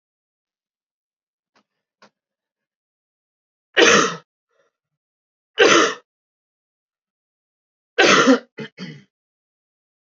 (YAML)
three_cough_length: 10.1 s
three_cough_amplitude: 29091
three_cough_signal_mean_std_ratio: 0.27
survey_phase: alpha (2021-03-01 to 2021-08-12)
age: 18-44
gender: Male
wearing_mask: 'No'
symptom_cough_any: true
symptom_change_to_sense_of_smell_or_taste: true
symptom_onset: 3 days
smoker_status: Never smoked
respiratory_condition_asthma: false
respiratory_condition_other: false
recruitment_source: Test and Trace
submission_delay: 2 days
covid_test_result: Positive
covid_test_method: RT-qPCR